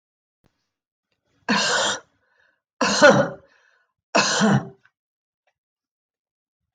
{"three_cough_length": "6.7 s", "three_cough_amplitude": 25089, "three_cough_signal_mean_std_ratio": 0.35, "survey_phase": "alpha (2021-03-01 to 2021-08-12)", "age": "45-64", "gender": "Female", "wearing_mask": "No", "symptom_none": true, "smoker_status": "Never smoked", "respiratory_condition_asthma": false, "respiratory_condition_other": false, "recruitment_source": "REACT", "submission_delay": "1 day", "covid_test_result": "Negative", "covid_test_method": "RT-qPCR"}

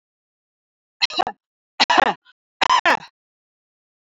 {"three_cough_length": "4.1 s", "three_cough_amplitude": 30413, "three_cough_signal_mean_std_ratio": 0.31, "survey_phase": "beta (2021-08-13 to 2022-03-07)", "age": "45-64", "gender": "Female", "wearing_mask": "No", "symptom_none": true, "symptom_onset": "6 days", "smoker_status": "Never smoked", "respiratory_condition_asthma": false, "respiratory_condition_other": false, "recruitment_source": "REACT", "submission_delay": "1 day", "covid_test_result": "Negative", "covid_test_method": "RT-qPCR", "influenza_a_test_result": "Unknown/Void", "influenza_b_test_result": "Unknown/Void"}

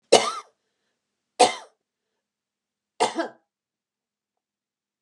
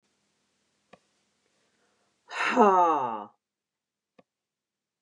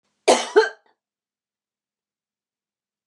{"three_cough_length": "5.0 s", "three_cough_amplitude": 30674, "three_cough_signal_mean_std_ratio": 0.22, "exhalation_length": "5.0 s", "exhalation_amplitude": 16655, "exhalation_signal_mean_std_ratio": 0.3, "cough_length": "3.1 s", "cough_amplitude": 27645, "cough_signal_mean_std_ratio": 0.23, "survey_phase": "beta (2021-08-13 to 2022-03-07)", "age": "65+", "gender": "Female", "wearing_mask": "No", "symptom_none": true, "smoker_status": "Never smoked", "respiratory_condition_asthma": false, "respiratory_condition_other": false, "recruitment_source": "REACT", "submission_delay": "1 day", "covid_test_result": "Negative", "covid_test_method": "RT-qPCR", "influenza_a_test_result": "Negative", "influenza_b_test_result": "Negative"}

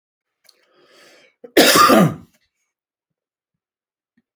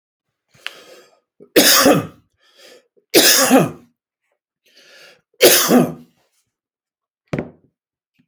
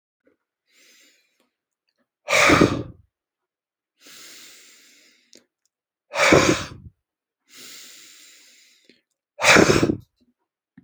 {"cough_length": "4.4 s", "cough_amplitude": 32768, "cough_signal_mean_std_ratio": 0.3, "three_cough_length": "8.3 s", "three_cough_amplitude": 32768, "three_cough_signal_mean_std_ratio": 0.36, "exhalation_length": "10.8 s", "exhalation_amplitude": 27530, "exhalation_signal_mean_std_ratio": 0.3, "survey_phase": "beta (2021-08-13 to 2022-03-07)", "age": "65+", "gender": "Male", "wearing_mask": "No", "symptom_none": true, "smoker_status": "Ex-smoker", "respiratory_condition_asthma": false, "respiratory_condition_other": false, "recruitment_source": "REACT", "submission_delay": "1 day", "covid_test_result": "Negative", "covid_test_method": "RT-qPCR"}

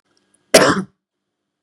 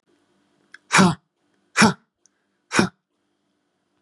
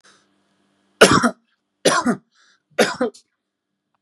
{"cough_length": "1.6 s", "cough_amplitude": 32768, "cough_signal_mean_std_ratio": 0.3, "exhalation_length": "4.0 s", "exhalation_amplitude": 31910, "exhalation_signal_mean_std_ratio": 0.28, "three_cough_length": "4.0 s", "three_cough_amplitude": 32768, "three_cough_signal_mean_std_ratio": 0.32, "survey_phase": "beta (2021-08-13 to 2022-03-07)", "age": "65+", "gender": "Male", "wearing_mask": "No", "symptom_none": true, "smoker_status": "Ex-smoker", "respiratory_condition_asthma": false, "respiratory_condition_other": false, "recruitment_source": "Test and Trace", "submission_delay": "1 day", "covid_test_result": "Negative", "covid_test_method": "RT-qPCR"}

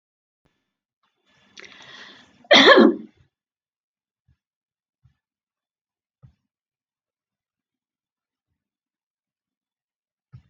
{"cough_length": "10.5 s", "cough_amplitude": 29397, "cough_signal_mean_std_ratio": 0.17, "survey_phase": "beta (2021-08-13 to 2022-03-07)", "age": "65+", "gender": "Female", "wearing_mask": "No", "symptom_none": true, "smoker_status": "Never smoked", "respiratory_condition_asthma": false, "respiratory_condition_other": false, "recruitment_source": "REACT", "submission_delay": "2 days", "covid_test_result": "Negative", "covid_test_method": "RT-qPCR"}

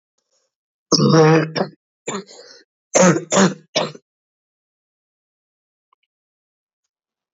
{"cough_length": "7.3 s", "cough_amplitude": 28618, "cough_signal_mean_std_ratio": 0.34, "survey_phase": "beta (2021-08-13 to 2022-03-07)", "age": "18-44", "gender": "Female", "wearing_mask": "No", "symptom_cough_any": true, "symptom_runny_or_blocked_nose": true, "symptom_sore_throat": true, "symptom_fatigue": true, "symptom_fever_high_temperature": true, "symptom_change_to_sense_of_smell_or_taste": true, "symptom_onset": "5 days", "smoker_status": "Never smoked", "respiratory_condition_asthma": false, "respiratory_condition_other": false, "recruitment_source": "Test and Trace", "submission_delay": "2 days", "covid_test_result": "Positive", "covid_test_method": "RT-qPCR", "covid_ct_value": 23.0, "covid_ct_gene": "N gene"}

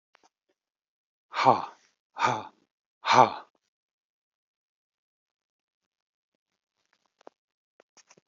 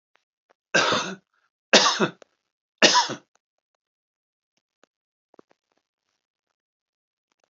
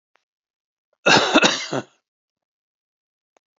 {"exhalation_length": "8.3 s", "exhalation_amplitude": 25132, "exhalation_signal_mean_std_ratio": 0.2, "three_cough_length": "7.5 s", "three_cough_amplitude": 30972, "three_cough_signal_mean_std_ratio": 0.26, "cough_length": "3.6 s", "cough_amplitude": 31217, "cough_signal_mean_std_ratio": 0.31, "survey_phase": "beta (2021-08-13 to 2022-03-07)", "age": "65+", "gender": "Male", "wearing_mask": "No", "symptom_none": true, "smoker_status": "Ex-smoker", "respiratory_condition_asthma": false, "respiratory_condition_other": false, "recruitment_source": "Test and Trace", "submission_delay": "0 days", "covid_test_result": "Negative", "covid_test_method": "LFT"}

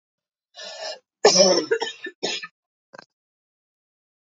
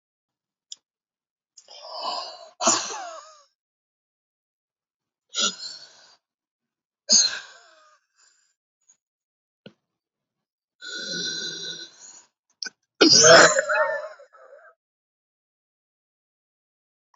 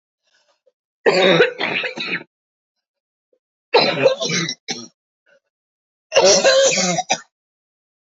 {"cough_length": "4.4 s", "cough_amplitude": 27551, "cough_signal_mean_std_ratio": 0.32, "exhalation_length": "17.2 s", "exhalation_amplitude": 32135, "exhalation_signal_mean_std_ratio": 0.27, "three_cough_length": "8.0 s", "three_cough_amplitude": 29503, "three_cough_signal_mean_std_ratio": 0.46, "survey_phase": "beta (2021-08-13 to 2022-03-07)", "age": "45-64", "gender": "Female", "wearing_mask": "No", "symptom_cough_any": true, "symptom_onset": "2 days", "smoker_status": "Never smoked", "respiratory_condition_asthma": true, "respiratory_condition_other": false, "recruitment_source": "Test and Trace", "submission_delay": "1 day", "covid_test_result": "Negative", "covid_test_method": "RT-qPCR"}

